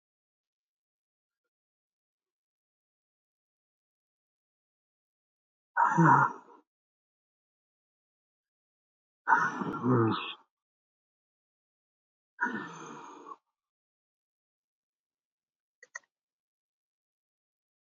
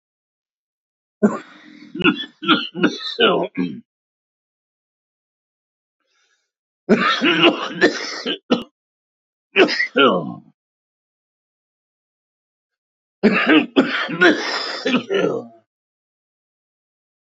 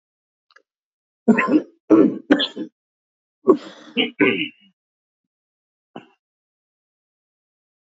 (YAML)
exhalation_length: 17.9 s
exhalation_amplitude: 10862
exhalation_signal_mean_std_ratio: 0.23
three_cough_length: 17.3 s
three_cough_amplitude: 28560
three_cough_signal_mean_std_ratio: 0.4
cough_length: 7.9 s
cough_amplitude: 27525
cough_signal_mean_std_ratio: 0.3
survey_phase: alpha (2021-03-01 to 2021-08-12)
age: 45-64
gender: Male
wearing_mask: 'No'
symptom_cough_any: true
symptom_shortness_of_breath: true
symptom_fatigue: true
symptom_onset: 13 days
smoker_status: Ex-smoker
respiratory_condition_asthma: false
respiratory_condition_other: true
recruitment_source: REACT
submission_delay: 2 days
covid_test_result: Negative
covid_test_method: RT-qPCR